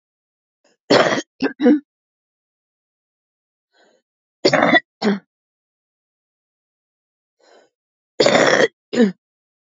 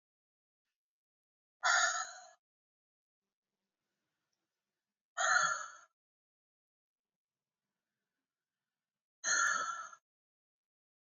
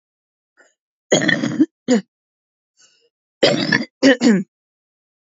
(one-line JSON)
{"three_cough_length": "9.7 s", "three_cough_amplitude": 31681, "three_cough_signal_mean_std_ratio": 0.32, "exhalation_length": "11.2 s", "exhalation_amplitude": 4333, "exhalation_signal_mean_std_ratio": 0.29, "cough_length": "5.2 s", "cough_amplitude": 29673, "cough_signal_mean_std_ratio": 0.39, "survey_phase": "beta (2021-08-13 to 2022-03-07)", "age": "45-64", "gender": "Female", "wearing_mask": "No", "symptom_cough_any": true, "symptom_runny_or_blocked_nose": true, "smoker_status": "Current smoker (11 or more cigarettes per day)", "respiratory_condition_asthma": false, "respiratory_condition_other": true, "recruitment_source": "REACT", "submission_delay": "17 days", "covid_test_result": "Negative", "covid_test_method": "RT-qPCR", "influenza_a_test_result": "Negative", "influenza_b_test_result": "Negative"}